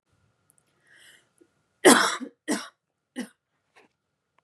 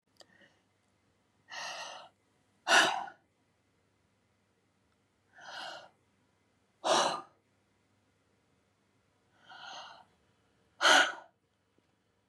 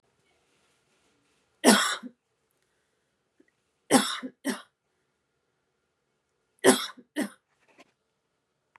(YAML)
cough_length: 4.4 s
cough_amplitude: 30078
cough_signal_mean_std_ratio: 0.23
exhalation_length: 12.3 s
exhalation_amplitude: 10833
exhalation_signal_mean_std_ratio: 0.25
three_cough_length: 8.8 s
three_cough_amplitude: 23849
three_cough_signal_mean_std_ratio: 0.23
survey_phase: beta (2021-08-13 to 2022-03-07)
age: 18-44
gender: Female
wearing_mask: 'No'
symptom_none: true
smoker_status: Never smoked
respiratory_condition_asthma: false
respiratory_condition_other: false
recruitment_source: REACT
submission_delay: 1 day
covid_test_result: Negative
covid_test_method: RT-qPCR